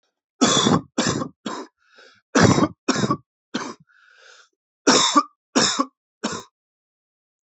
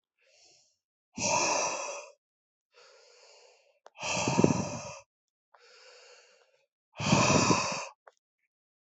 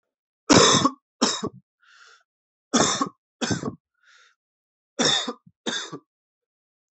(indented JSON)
{
  "cough_length": "7.4 s",
  "cough_amplitude": 28791,
  "cough_signal_mean_std_ratio": 0.42,
  "exhalation_length": "9.0 s",
  "exhalation_amplitude": 17599,
  "exhalation_signal_mean_std_ratio": 0.4,
  "three_cough_length": "6.9 s",
  "three_cough_amplitude": 25910,
  "three_cough_signal_mean_std_ratio": 0.36,
  "survey_phase": "alpha (2021-03-01 to 2021-08-12)",
  "age": "18-44",
  "gender": "Male",
  "wearing_mask": "No",
  "symptom_cough_any": true,
  "smoker_status": "Never smoked",
  "respiratory_condition_asthma": false,
  "respiratory_condition_other": false,
  "recruitment_source": "Test and Trace",
  "submission_delay": "2 days",
  "covid_test_result": "Positive",
  "covid_test_method": "LFT"
}